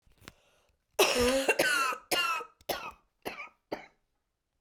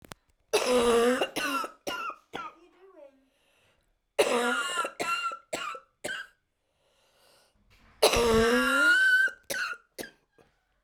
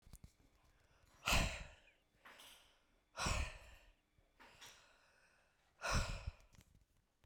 cough_length: 4.6 s
cough_amplitude: 9393
cough_signal_mean_std_ratio: 0.48
three_cough_length: 10.8 s
three_cough_amplitude: 13480
three_cough_signal_mean_std_ratio: 0.53
exhalation_length: 7.3 s
exhalation_amplitude: 3190
exhalation_signal_mean_std_ratio: 0.35
survey_phase: beta (2021-08-13 to 2022-03-07)
age: 45-64
gender: Female
wearing_mask: 'No'
symptom_cough_any: true
symptom_runny_or_blocked_nose: true
symptom_sore_throat: true
symptom_headache: true
symptom_other: true
symptom_onset: 4 days
smoker_status: Never smoked
respiratory_condition_asthma: true
respiratory_condition_other: false
recruitment_source: Test and Trace
submission_delay: 2 days
covid_test_result: Positive
covid_test_method: RT-qPCR
covid_ct_value: 30.4
covid_ct_gene: ORF1ab gene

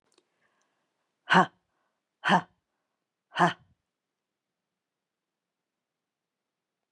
exhalation_length: 6.9 s
exhalation_amplitude: 19121
exhalation_signal_mean_std_ratio: 0.19
survey_phase: beta (2021-08-13 to 2022-03-07)
age: 65+
gender: Female
wearing_mask: 'No'
symptom_none: true
symptom_onset: 6 days
smoker_status: Ex-smoker
respiratory_condition_asthma: false
respiratory_condition_other: false
recruitment_source: REACT
submission_delay: 1 day
covid_test_result: Negative
covid_test_method: RT-qPCR
influenza_a_test_result: Negative
influenza_b_test_result: Negative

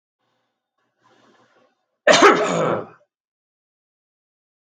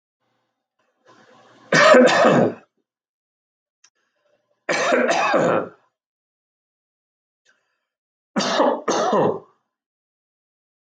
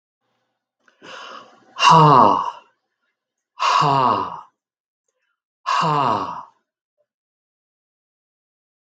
cough_length: 4.6 s
cough_amplitude: 32766
cough_signal_mean_std_ratio: 0.28
three_cough_length: 10.9 s
three_cough_amplitude: 32768
three_cough_signal_mean_std_ratio: 0.39
exhalation_length: 9.0 s
exhalation_amplitude: 32766
exhalation_signal_mean_std_ratio: 0.37
survey_phase: beta (2021-08-13 to 2022-03-07)
age: 45-64
gender: Male
wearing_mask: 'No'
symptom_none: true
smoker_status: Never smoked
respiratory_condition_asthma: false
respiratory_condition_other: false
recruitment_source: REACT
submission_delay: 0 days
covid_test_result: Negative
covid_test_method: RT-qPCR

